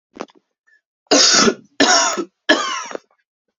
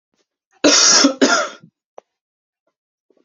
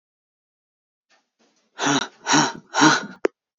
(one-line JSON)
{"three_cough_length": "3.6 s", "three_cough_amplitude": 32767, "three_cough_signal_mean_std_ratio": 0.47, "cough_length": "3.2 s", "cough_amplitude": 32768, "cough_signal_mean_std_ratio": 0.4, "exhalation_length": "3.6 s", "exhalation_amplitude": 25366, "exhalation_signal_mean_std_ratio": 0.37, "survey_phase": "alpha (2021-03-01 to 2021-08-12)", "age": "18-44", "gender": "Male", "wearing_mask": "No", "symptom_cough_any": true, "symptom_new_continuous_cough": true, "symptom_shortness_of_breath": true, "symptom_fatigue": true, "symptom_fever_high_temperature": true, "symptom_headache": true, "symptom_change_to_sense_of_smell_or_taste": true, "symptom_onset": "3 days", "smoker_status": "Never smoked", "respiratory_condition_asthma": false, "respiratory_condition_other": false, "recruitment_source": "Test and Trace", "submission_delay": "2 days", "covid_test_result": "Positive", "covid_test_method": "RT-qPCR", "covid_ct_value": 28.2, "covid_ct_gene": "N gene"}